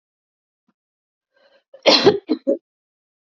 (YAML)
cough_length: 3.3 s
cough_amplitude: 28439
cough_signal_mean_std_ratio: 0.28
survey_phase: beta (2021-08-13 to 2022-03-07)
age: 18-44
gender: Female
wearing_mask: 'No'
symptom_cough_any: true
symptom_new_continuous_cough: true
symptom_runny_or_blocked_nose: true
symptom_sore_throat: true
symptom_abdominal_pain: true
symptom_fatigue: true
symptom_fever_high_temperature: true
symptom_other: true
smoker_status: Never smoked
respiratory_condition_asthma: false
respiratory_condition_other: false
recruitment_source: Test and Trace
submission_delay: 3 days
covid_test_result: Positive
covid_test_method: RT-qPCR
covid_ct_value: 20.7
covid_ct_gene: ORF1ab gene
covid_ct_mean: 21.2
covid_viral_load: 110000 copies/ml
covid_viral_load_category: Low viral load (10K-1M copies/ml)